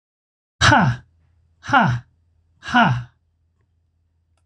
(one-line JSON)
{"exhalation_length": "4.5 s", "exhalation_amplitude": 25485, "exhalation_signal_mean_std_ratio": 0.39, "survey_phase": "beta (2021-08-13 to 2022-03-07)", "age": "65+", "gender": "Male", "wearing_mask": "No", "symptom_none": true, "smoker_status": "Never smoked", "respiratory_condition_asthma": false, "respiratory_condition_other": false, "recruitment_source": "REACT", "submission_delay": "5 days", "covid_test_result": "Negative", "covid_test_method": "RT-qPCR"}